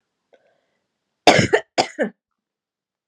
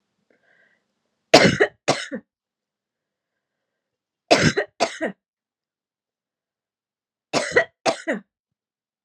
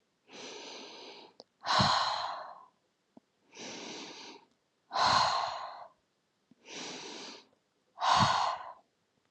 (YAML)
cough_length: 3.1 s
cough_amplitude: 32768
cough_signal_mean_std_ratio: 0.27
three_cough_length: 9.0 s
three_cough_amplitude: 32768
three_cough_signal_mean_std_ratio: 0.27
exhalation_length: 9.3 s
exhalation_amplitude: 7226
exhalation_signal_mean_std_ratio: 0.45
survey_phase: beta (2021-08-13 to 2022-03-07)
age: 18-44
gender: Female
wearing_mask: 'No'
symptom_none: true
symptom_onset: 10 days
smoker_status: Never smoked
respiratory_condition_asthma: false
respiratory_condition_other: false
recruitment_source: REACT
submission_delay: 2 days
covid_test_result: Negative
covid_test_method: RT-qPCR
influenza_a_test_result: Negative
influenza_b_test_result: Negative